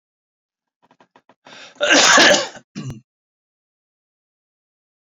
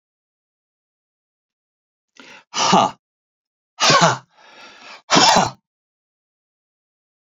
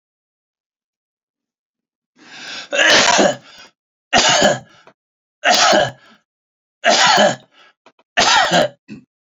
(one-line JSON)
{"cough_length": "5.0 s", "cough_amplitude": 32326, "cough_signal_mean_std_ratio": 0.31, "exhalation_length": "7.3 s", "exhalation_amplitude": 32767, "exhalation_signal_mean_std_ratio": 0.31, "three_cough_length": "9.2 s", "three_cough_amplitude": 30233, "three_cough_signal_mean_std_ratio": 0.46, "survey_phase": "beta (2021-08-13 to 2022-03-07)", "age": "65+", "gender": "Male", "wearing_mask": "No", "symptom_none": true, "smoker_status": "Never smoked", "respiratory_condition_asthma": false, "respiratory_condition_other": false, "recruitment_source": "REACT", "submission_delay": "2 days", "covid_test_result": "Negative", "covid_test_method": "RT-qPCR"}